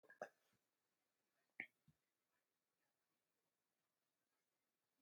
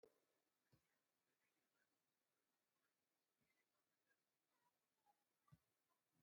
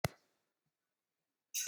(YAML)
three_cough_length: 5.0 s
three_cough_amplitude: 661
three_cough_signal_mean_std_ratio: 0.15
cough_length: 6.2 s
cough_amplitude: 42
cough_signal_mean_std_ratio: 0.43
exhalation_length: 1.7 s
exhalation_amplitude: 5265
exhalation_signal_mean_std_ratio: 0.23
survey_phase: beta (2021-08-13 to 2022-03-07)
age: 45-64
gender: Male
wearing_mask: 'No'
symptom_none: true
smoker_status: Ex-smoker
respiratory_condition_asthma: false
respiratory_condition_other: false
recruitment_source: REACT
submission_delay: 5 days
covid_test_result: Negative
covid_test_method: RT-qPCR
influenza_a_test_result: Negative
influenza_b_test_result: Negative